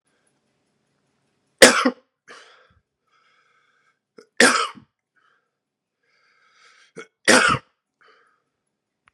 {"three_cough_length": "9.1 s", "three_cough_amplitude": 32768, "three_cough_signal_mean_std_ratio": 0.22, "survey_phase": "beta (2021-08-13 to 2022-03-07)", "age": "45-64", "gender": "Male", "wearing_mask": "No", "symptom_cough_any": true, "symptom_runny_or_blocked_nose": true, "symptom_sore_throat": true, "symptom_diarrhoea": true, "symptom_fatigue": true, "symptom_headache": true, "symptom_change_to_sense_of_smell_or_taste": true, "symptom_onset": "2 days", "smoker_status": "Ex-smoker", "respiratory_condition_asthma": false, "respiratory_condition_other": false, "recruitment_source": "Test and Trace", "submission_delay": "0 days", "covid_test_result": "Positive", "covid_test_method": "RT-qPCR", "covid_ct_value": 16.9, "covid_ct_gene": "N gene"}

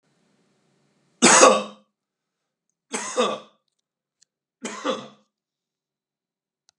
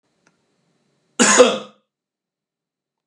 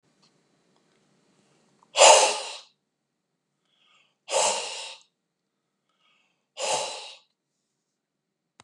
{"three_cough_length": "6.8 s", "three_cough_amplitude": 32749, "three_cough_signal_mean_std_ratio": 0.26, "cough_length": "3.1 s", "cough_amplitude": 32767, "cough_signal_mean_std_ratio": 0.27, "exhalation_length": "8.6 s", "exhalation_amplitude": 30167, "exhalation_signal_mean_std_ratio": 0.25, "survey_phase": "beta (2021-08-13 to 2022-03-07)", "age": "45-64", "gender": "Male", "wearing_mask": "No", "symptom_none": true, "smoker_status": "Never smoked", "respiratory_condition_asthma": false, "respiratory_condition_other": false, "recruitment_source": "REACT", "submission_delay": "2 days", "covid_test_result": "Negative", "covid_test_method": "RT-qPCR", "influenza_a_test_result": "Negative", "influenza_b_test_result": "Negative"}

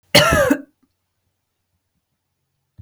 {"cough_length": "2.8 s", "cough_amplitude": 32768, "cough_signal_mean_std_ratio": 0.31, "survey_phase": "beta (2021-08-13 to 2022-03-07)", "age": "45-64", "gender": "Female", "wearing_mask": "No", "symptom_none": true, "smoker_status": "Never smoked", "respiratory_condition_asthma": false, "respiratory_condition_other": false, "recruitment_source": "REACT", "submission_delay": "1 day", "covid_test_result": "Negative", "covid_test_method": "RT-qPCR", "influenza_a_test_result": "Negative", "influenza_b_test_result": "Negative"}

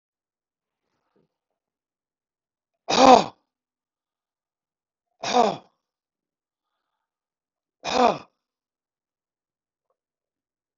{"three_cough_length": "10.8 s", "three_cough_amplitude": 30003, "three_cough_signal_mean_std_ratio": 0.18, "survey_phase": "beta (2021-08-13 to 2022-03-07)", "age": "65+", "gender": "Male", "wearing_mask": "No", "symptom_none": true, "smoker_status": "Never smoked", "respiratory_condition_asthma": false, "respiratory_condition_other": false, "recruitment_source": "REACT", "submission_delay": "2 days", "covid_test_result": "Negative", "covid_test_method": "RT-qPCR", "influenza_a_test_result": "Negative", "influenza_b_test_result": "Negative"}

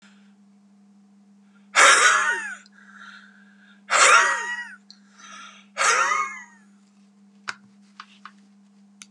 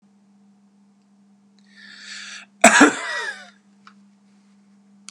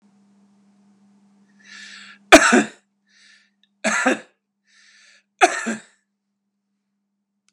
{"exhalation_length": "9.1 s", "exhalation_amplitude": 28070, "exhalation_signal_mean_std_ratio": 0.38, "cough_length": "5.1 s", "cough_amplitude": 32768, "cough_signal_mean_std_ratio": 0.25, "three_cough_length": "7.5 s", "three_cough_amplitude": 32768, "three_cough_signal_mean_std_ratio": 0.24, "survey_phase": "beta (2021-08-13 to 2022-03-07)", "age": "45-64", "gender": "Male", "wearing_mask": "No", "symptom_none": true, "smoker_status": "Never smoked", "respiratory_condition_asthma": false, "respiratory_condition_other": false, "recruitment_source": "REACT", "submission_delay": "1 day", "covid_test_result": "Negative", "covid_test_method": "RT-qPCR", "influenza_a_test_result": "Unknown/Void", "influenza_b_test_result": "Unknown/Void"}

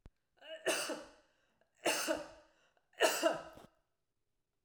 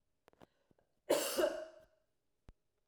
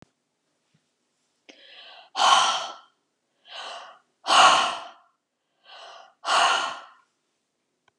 {"three_cough_length": "4.6 s", "three_cough_amplitude": 4434, "three_cough_signal_mean_std_ratio": 0.4, "cough_length": "2.9 s", "cough_amplitude": 3115, "cough_signal_mean_std_ratio": 0.34, "exhalation_length": "8.0 s", "exhalation_amplitude": 26611, "exhalation_signal_mean_std_ratio": 0.35, "survey_phase": "alpha (2021-03-01 to 2021-08-12)", "age": "45-64", "gender": "Female", "wearing_mask": "No", "symptom_none": true, "symptom_onset": "5 days", "smoker_status": "Never smoked", "respiratory_condition_asthma": false, "respiratory_condition_other": false, "recruitment_source": "REACT", "submission_delay": "2 days", "covid_test_result": "Negative", "covid_test_method": "RT-qPCR"}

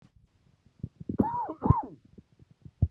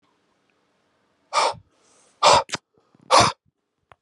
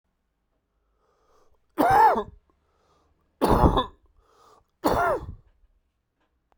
{"cough_length": "2.9 s", "cough_amplitude": 14576, "cough_signal_mean_std_ratio": 0.33, "exhalation_length": "4.0 s", "exhalation_amplitude": 25465, "exhalation_signal_mean_std_ratio": 0.31, "three_cough_length": "6.6 s", "three_cough_amplitude": 22554, "three_cough_signal_mean_std_ratio": 0.35, "survey_phase": "beta (2021-08-13 to 2022-03-07)", "age": "45-64", "gender": "Male", "wearing_mask": "No", "symptom_cough_any": true, "symptom_runny_or_blocked_nose": true, "symptom_shortness_of_breath": true, "symptom_sore_throat": true, "symptom_fatigue": true, "symptom_fever_high_temperature": true, "symptom_headache": true, "symptom_change_to_sense_of_smell_or_taste": true, "symptom_loss_of_taste": true, "smoker_status": "Never smoked", "respiratory_condition_asthma": false, "respiratory_condition_other": false, "recruitment_source": "Test and Trace", "submission_delay": "2 days", "covid_test_result": "Positive", "covid_test_method": "RT-qPCR", "covid_ct_value": 16.6, "covid_ct_gene": "ORF1ab gene", "covid_ct_mean": 17.1, "covid_viral_load": "2400000 copies/ml", "covid_viral_load_category": "High viral load (>1M copies/ml)"}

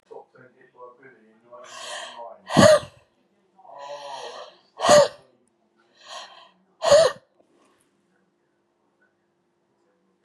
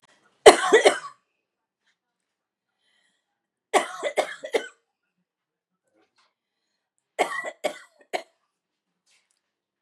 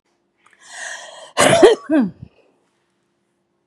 {"exhalation_length": "10.2 s", "exhalation_amplitude": 28355, "exhalation_signal_mean_std_ratio": 0.27, "three_cough_length": "9.8 s", "three_cough_amplitude": 32768, "three_cough_signal_mean_std_ratio": 0.21, "cough_length": "3.7 s", "cough_amplitude": 32768, "cough_signal_mean_std_ratio": 0.34, "survey_phase": "beta (2021-08-13 to 2022-03-07)", "age": "45-64", "gender": "Female", "wearing_mask": "No", "symptom_none": true, "smoker_status": "Ex-smoker", "respiratory_condition_asthma": false, "respiratory_condition_other": false, "recruitment_source": "REACT", "submission_delay": "1 day", "covid_test_result": "Negative", "covid_test_method": "RT-qPCR", "influenza_a_test_result": "Negative", "influenza_b_test_result": "Negative"}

